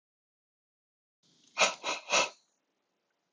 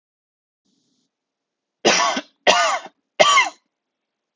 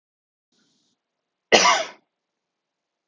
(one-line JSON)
{"exhalation_length": "3.3 s", "exhalation_amplitude": 8202, "exhalation_signal_mean_std_ratio": 0.28, "three_cough_length": "4.4 s", "three_cough_amplitude": 32768, "three_cough_signal_mean_std_ratio": 0.37, "cough_length": "3.1 s", "cough_amplitude": 32768, "cough_signal_mean_std_ratio": 0.24, "survey_phase": "alpha (2021-03-01 to 2021-08-12)", "age": "18-44", "gender": "Male", "wearing_mask": "No", "symptom_fatigue": true, "symptom_headache": true, "symptom_onset": "5 days", "smoker_status": "Never smoked", "respiratory_condition_asthma": false, "respiratory_condition_other": false, "recruitment_source": "REACT", "submission_delay": "1 day", "covid_test_result": "Negative", "covid_test_method": "RT-qPCR"}